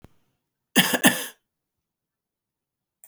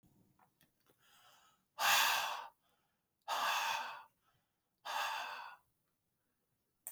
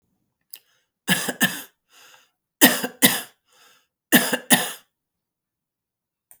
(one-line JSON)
{"cough_length": "3.1 s", "cough_amplitude": 28818, "cough_signal_mean_std_ratio": 0.25, "exhalation_length": "6.9 s", "exhalation_amplitude": 3887, "exhalation_signal_mean_std_ratio": 0.41, "three_cough_length": "6.4 s", "three_cough_amplitude": 32768, "three_cough_signal_mean_std_ratio": 0.29, "survey_phase": "alpha (2021-03-01 to 2021-08-12)", "age": "45-64", "gender": "Female", "wearing_mask": "No", "symptom_shortness_of_breath": true, "symptom_fatigue": true, "symptom_headache": true, "symptom_onset": "12 days", "smoker_status": "Ex-smoker", "respiratory_condition_asthma": false, "respiratory_condition_other": false, "recruitment_source": "REACT", "submission_delay": "3 days", "covid_test_result": "Negative", "covid_test_method": "RT-qPCR"}